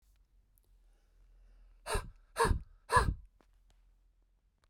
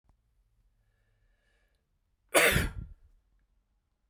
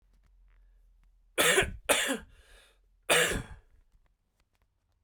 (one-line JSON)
{"exhalation_length": "4.7 s", "exhalation_amplitude": 6956, "exhalation_signal_mean_std_ratio": 0.3, "cough_length": "4.1 s", "cough_amplitude": 15147, "cough_signal_mean_std_ratio": 0.25, "three_cough_length": "5.0 s", "three_cough_amplitude": 12466, "three_cough_signal_mean_std_ratio": 0.36, "survey_phase": "beta (2021-08-13 to 2022-03-07)", "age": "18-44", "gender": "Male", "wearing_mask": "No", "symptom_cough_any": true, "symptom_runny_or_blocked_nose": true, "smoker_status": "Never smoked", "respiratory_condition_asthma": false, "respiratory_condition_other": false, "recruitment_source": "Test and Trace", "submission_delay": "2 days", "covid_test_result": "Positive", "covid_test_method": "RT-qPCR", "covid_ct_value": 38.0, "covid_ct_gene": "ORF1ab gene"}